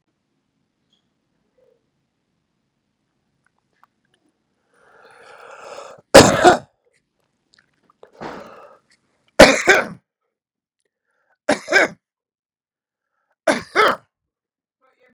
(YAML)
three_cough_length: 15.1 s
three_cough_amplitude: 32768
three_cough_signal_mean_std_ratio: 0.21
survey_phase: beta (2021-08-13 to 2022-03-07)
age: 65+
gender: Male
wearing_mask: 'No'
symptom_runny_or_blocked_nose: true
symptom_sore_throat: true
symptom_onset: 6 days
smoker_status: Never smoked
respiratory_condition_asthma: false
respiratory_condition_other: false
recruitment_source: Test and Trace
submission_delay: 2 days
covid_test_result: Positive
covid_test_method: RT-qPCR
covid_ct_value: 12.6
covid_ct_gene: ORF1ab gene
covid_ct_mean: 13.0
covid_viral_load: 56000000 copies/ml
covid_viral_load_category: High viral load (>1M copies/ml)